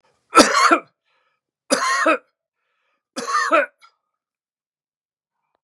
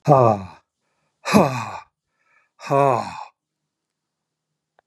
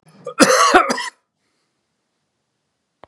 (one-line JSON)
{"three_cough_length": "5.6 s", "three_cough_amplitude": 32768, "three_cough_signal_mean_std_ratio": 0.36, "exhalation_length": "4.9 s", "exhalation_amplitude": 31914, "exhalation_signal_mean_std_ratio": 0.34, "cough_length": "3.1 s", "cough_amplitude": 32768, "cough_signal_mean_std_ratio": 0.35, "survey_phase": "beta (2021-08-13 to 2022-03-07)", "age": "65+", "gender": "Male", "wearing_mask": "No", "symptom_none": true, "smoker_status": "Never smoked", "respiratory_condition_asthma": false, "respiratory_condition_other": false, "recruitment_source": "REACT", "submission_delay": "2 days", "covid_test_result": "Negative", "covid_test_method": "RT-qPCR", "influenza_a_test_result": "Negative", "influenza_b_test_result": "Negative"}